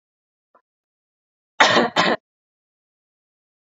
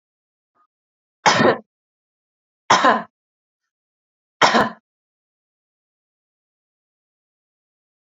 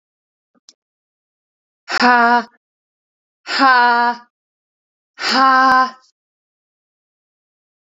cough_length: 3.7 s
cough_amplitude: 29275
cough_signal_mean_std_ratio: 0.27
three_cough_length: 8.1 s
three_cough_amplitude: 31610
three_cough_signal_mean_std_ratio: 0.25
exhalation_length: 7.9 s
exhalation_amplitude: 31295
exhalation_signal_mean_std_ratio: 0.39
survey_phase: beta (2021-08-13 to 2022-03-07)
age: 18-44
gender: Female
wearing_mask: 'No'
symptom_none: true
smoker_status: Never smoked
respiratory_condition_asthma: false
respiratory_condition_other: false
recruitment_source: REACT
submission_delay: 1 day
covid_test_result: Negative
covid_test_method: RT-qPCR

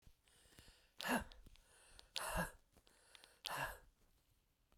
exhalation_length: 4.8 s
exhalation_amplitude: 2365
exhalation_signal_mean_std_ratio: 0.38
survey_phase: beta (2021-08-13 to 2022-03-07)
age: 45-64
gender: Female
wearing_mask: 'No'
symptom_cough_any: true
symptom_runny_or_blocked_nose: true
symptom_sore_throat: true
symptom_fatigue: true
symptom_headache: true
smoker_status: Ex-smoker
respiratory_condition_asthma: true
respiratory_condition_other: false
recruitment_source: Test and Trace
submission_delay: 1 day
covid_test_result: Positive
covid_test_method: LFT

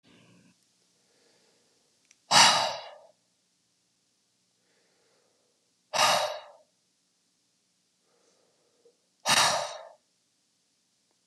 exhalation_length: 11.3 s
exhalation_amplitude: 19348
exhalation_signal_mean_std_ratio: 0.26
survey_phase: beta (2021-08-13 to 2022-03-07)
age: 18-44
gender: Male
wearing_mask: 'No'
symptom_runny_or_blocked_nose: true
symptom_change_to_sense_of_smell_or_taste: true
symptom_loss_of_taste: true
smoker_status: Never smoked
respiratory_condition_asthma: false
respiratory_condition_other: false
recruitment_source: Test and Trace
submission_delay: 1 day
covid_test_result: Positive
covid_test_method: RT-qPCR
covid_ct_value: 26.1
covid_ct_gene: ORF1ab gene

